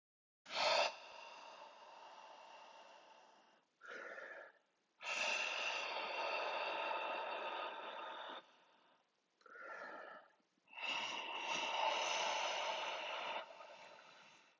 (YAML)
exhalation_length: 14.6 s
exhalation_amplitude: 2274
exhalation_signal_mean_std_ratio: 0.67
survey_phase: alpha (2021-03-01 to 2021-08-12)
age: 45-64
gender: Male
wearing_mask: 'No'
symptom_cough_any: true
symptom_shortness_of_breath: true
symptom_fatigue: true
symptom_fever_high_temperature: true
symptom_headache: true
symptom_onset: 5 days
smoker_status: Never smoked
respiratory_condition_asthma: false
respiratory_condition_other: false
recruitment_source: Test and Trace
submission_delay: 2 days
covid_test_result: Positive
covid_test_method: RT-qPCR